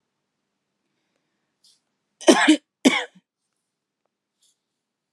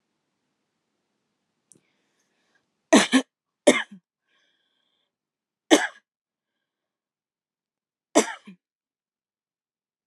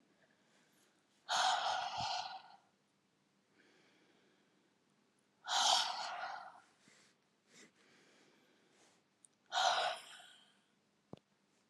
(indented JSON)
{
  "cough_length": "5.1 s",
  "cough_amplitude": 31705,
  "cough_signal_mean_std_ratio": 0.22,
  "three_cough_length": "10.1 s",
  "three_cough_amplitude": 30207,
  "three_cough_signal_mean_std_ratio": 0.18,
  "exhalation_length": "11.7 s",
  "exhalation_amplitude": 3617,
  "exhalation_signal_mean_std_ratio": 0.37,
  "survey_phase": "alpha (2021-03-01 to 2021-08-12)",
  "age": "18-44",
  "gender": "Female",
  "wearing_mask": "No",
  "symptom_cough_any": true,
  "symptom_abdominal_pain": true,
  "symptom_fatigue": true,
  "symptom_headache": true,
  "symptom_onset": "3 days",
  "smoker_status": "Ex-smoker",
  "respiratory_condition_asthma": false,
  "respiratory_condition_other": false,
  "recruitment_source": "Test and Trace",
  "submission_delay": "2 days",
  "covid_test_result": "Positive",
  "covid_test_method": "RT-qPCR",
  "covid_ct_value": 17.1,
  "covid_ct_gene": "N gene",
  "covid_ct_mean": 18.0,
  "covid_viral_load": "1300000 copies/ml",
  "covid_viral_load_category": "High viral load (>1M copies/ml)"
}